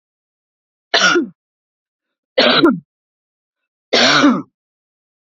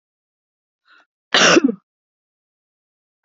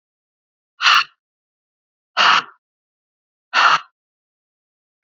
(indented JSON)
{
  "three_cough_length": "5.3 s",
  "three_cough_amplitude": 30411,
  "three_cough_signal_mean_std_ratio": 0.4,
  "cough_length": "3.2 s",
  "cough_amplitude": 28586,
  "cough_signal_mean_std_ratio": 0.26,
  "exhalation_length": "5.0 s",
  "exhalation_amplitude": 29984,
  "exhalation_signal_mean_std_ratio": 0.3,
  "survey_phase": "beta (2021-08-13 to 2022-03-07)",
  "age": "65+",
  "gender": "Female",
  "wearing_mask": "No",
  "symptom_runny_or_blocked_nose": true,
  "smoker_status": "Ex-smoker",
  "respiratory_condition_asthma": false,
  "respiratory_condition_other": false,
  "recruitment_source": "REACT",
  "submission_delay": "1 day",
  "covid_test_result": "Negative",
  "covid_test_method": "RT-qPCR",
  "influenza_a_test_result": "Negative",
  "influenza_b_test_result": "Negative"
}